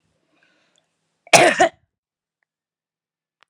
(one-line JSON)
{"cough_length": "3.5 s", "cough_amplitude": 32768, "cough_signal_mean_std_ratio": 0.23, "survey_phase": "alpha (2021-03-01 to 2021-08-12)", "age": "65+", "gender": "Female", "wearing_mask": "No", "symptom_none": true, "smoker_status": "Never smoked", "respiratory_condition_asthma": false, "respiratory_condition_other": false, "recruitment_source": "REACT", "submission_delay": "3 days", "covid_test_result": "Negative", "covid_test_method": "RT-qPCR"}